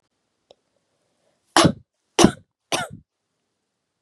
{"three_cough_length": "4.0 s", "three_cough_amplitude": 32767, "three_cough_signal_mean_std_ratio": 0.22, "survey_phase": "beta (2021-08-13 to 2022-03-07)", "age": "18-44", "gender": "Female", "wearing_mask": "No", "symptom_runny_or_blocked_nose": true, "symptom_fatigue": true, "symptom_onset": "3 days", "smoker_status": "Never smoked", "respiratory_condition_asthma": false, "respiratory_condition_other": false, "recruitment_source": "Test and Trace", "submission_delay": "2 days", "covid_test_result": "Positive", "covid_test_method": "RT-qPCR", "covid_ct_value": 19.5, "covid_ct_gene": "N gene", "covid_ct_mean": 19.8, "covid_viral_load": "320000 copies/ml", "covid_viral_load_category": "Low viral load (10K-1M copies/ml)"}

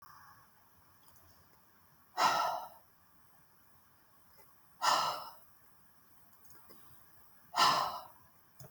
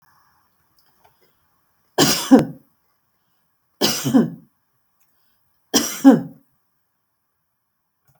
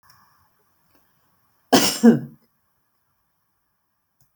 {"exhalation_length": "8.7 s", "exhalation_amplitude": 6497, "exhalation_signal_mean_std_ratio": 0.35, "three_cough_length": "8.2 s", "three_cough_amplitude": 32768, "three_cough_signal_mean_std_ratio": 0.28, "cough_length": "4.4 s", "cough_amplitude": 32768, "cough_signal_mean_std_ratio": 0.23, "survey_phase": "beta (2021-08-13 to 2022-03-07)", "age": "65+", "gender": "Female", "wearing_mask": "No", "symptom_none": true, "smoker_status": "Never smoked", "respiratory_condition_asthma": false, "respiratory_condition_other": false, "recruitment_source": "REACT", "submission_delay": "2 days", "covid_test_result": "Negative", "covid_test_method": "RT-qPCR"}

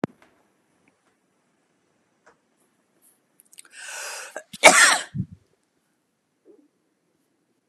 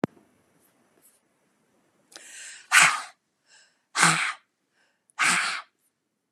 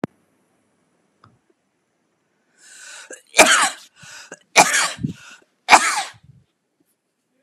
{"cough_length": "7.7 s", "cough_amplitude": 32768, "cough_signal_mean_std_ratio": 0.2, "exhalation_length": "6.3 s", "exhalation_amplitude": 29992, "exhalation_signal_mean_std_ratio": 0.31, "three_cough_length": "7.4 s", "three_cough_amplitude": 32768, "three_cough_signal_mean_std_ratio": 0.28, "survey_phase": "beta (2021-08-13 to 2022-03-07)", "age": "45-64", "gender": "Female", "wearing_mask": "No", "symptom_shortness_of_breath": true, "symptom_fatigue": true, "smoker_status": "Never smoked", "respiratory_condition_asthma": false, "respiratory_condition_other": false, "recruitment_source": "REACT", "submission_delay": "1 day", "covid_test_result": "Negative", "covid_test_method": "RT-qPCR", "influenza_a_test_result": "Negative", "influenza_b_test_result": "Negative"}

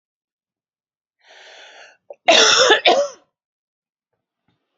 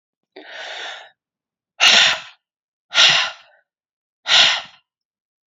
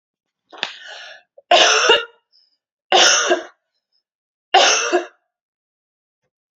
{"cough_length": "4.8 s", "cough_amplitude": 29671, "cough_signal_mean_std_ratio": 0.33, "exhalation_length": "5.5 s", "exhalation_amplitude": 32768, "exhalation_signal_mean_std_ratio": 0.37, "three_cough_length": "6.6 s", "three_cough_amplitude": 32767, "three_cough_signal_mean_std_ratio": 0.39, "survey_phase": "alpha (2021-03-01 to 2021-08-12)", "age": "45-64", "gender": "Female", "wearing_mask": "No", "symptom_cough_any": true, "symptom_shortness_of_breath": true, "symptom_fatigue": true, "symptom_headache": true, "symptom_onset": "9 days", "smoker_status": "Ex-smoker", "respiratory_condition_asthma": false, "respiratory_condition_other": false, "recruitment_source": "Test and Trace", "submission_delay": "2 days", "covid_test_result": "Positive", "covid_test_method": "RT-qPCR", "covid_ct_value": 23.2, "covid_ct_gene": "ORF1ab gene", "covid_ct_mean": 24.2, "covid_viral_load": "11000 copies/ml", "covid_viral_load_category": "Low viral load (10K-1M copies/ml)"}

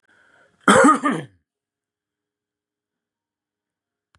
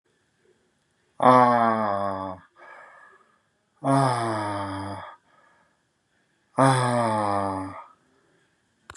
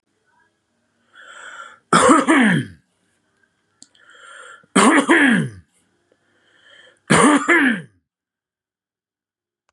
{"cough_length": "4.2 s", "cough_amplitude": 30914, "cough_signal_mean_std_ratio": 0.26, "exhalation_length": "9.0 s", "exhalation_amplitude": 25082, "exhalation_signal_mean_std_ratio": 0.45, "three_cough_length": "9.7 s", "three_cough_amplitude": 32469, "three_cough_signal_mean_std_ratio": 0.39, "survey_phase": "beta (2021-08-13 to 2022-03-07)", "age": "45-64", "gender": "Male", "wearing_mask": "No", "symptom_none": true, "smoker_status": "Never smoked", "respiratory_condition_asthma": false, "respiratory_condition_other": false, "recruitment_source": "REACT", "submission_delay": "3 days", "covid_test_result": "Negative", "covid_test_method": "RT-qPCR", "influenza_a_test_result": "Negative", "influenza_b_test_result": "Negative"}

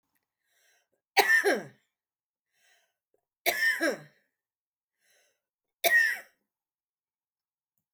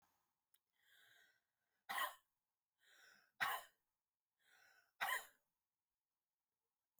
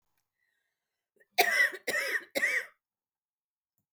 {"three_cough_length": "7.9 s", "three_cough_amplitude": 16781, "three_cough_signal_mean_std_ratio": 0.31, "exhalation_length": "7.0 s", "exhalation_amplitude": 1456, "exhalation_signal_mean_std_ratio": 0.26, "cough_length": "3.9 s", "cough_amplitude": 10413, "cough_signal_mean_std_ratio": 0.38, "survey_phase": "alpha (2021-03-01 to 2021-08-12)", "age": "45-64", "gender": "Female", "wearing_mask": "No", "symptom_none": true, "smoker_status": "Ex-smoker", "respiratory_condition_asthma": false, "respiratory_condition_other": true, "recruitment_source": "REACT", "submission_delay": "1 day", "covid_test_result": "Negative", "covid_test_method": "RT-qPCR"}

